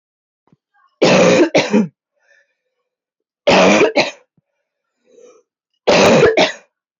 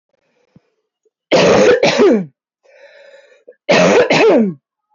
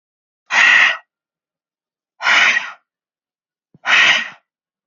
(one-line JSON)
{"three_cough_length": "7.0 s", "three_cough_amplitude": 31048, "three_cough_signal_mean_std_ratio": 0.46, "cough_length": "4.9 s", "cough_amplitude": 28973, "cough_signal_mean_std_ratio": 0.55, "exhalation_length": "4.9 s", "exhalation_amplitude": 32411, "exhalation_signal_mean_std_ratio": 0.42, "survey_phase": "beta (2021-08-13 to 2022-03-07)", "age": "18-44", "gender": "Female", "wearing_mask": "No", "symptom_cough_any": true, "symptom_runny_or_blocked_nose": true, "symptom_headache": true, "symptom_other": true, "smoker_status": "Ex-smoker", "respiratory_condition_asthma": false, "respiratory_condition_other": false, "recruitment_source": "Test and Trace", "submission_delay": "1 day", "covid_test_result": "Positive", "covid_test_method": "LFT"}